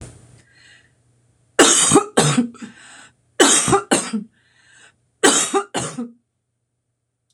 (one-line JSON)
{"three_cough_length": "7.3 s", "three_cough_amplitude": 26028, "three_cough_signal_mean_std_ratio": 0.42, "survey_phase": "beta (2021-08-13 to 2022-03-07)", "age": "65+", "gender": "Female", "wearing_mask": "No", "symptom_runny_or_blocked_nose": true, "symptom_sore_throat": true, "symptom_fatigue": true, "smoker_status": "Never smoked", "respiratory_condition_asthma": false, "respiratory_condition_other": false, "recruitment_source": "REACT", "submission_delay": "2 days", "covid_test_result": "Negative", "covid_test_method": "RT-qPCR"}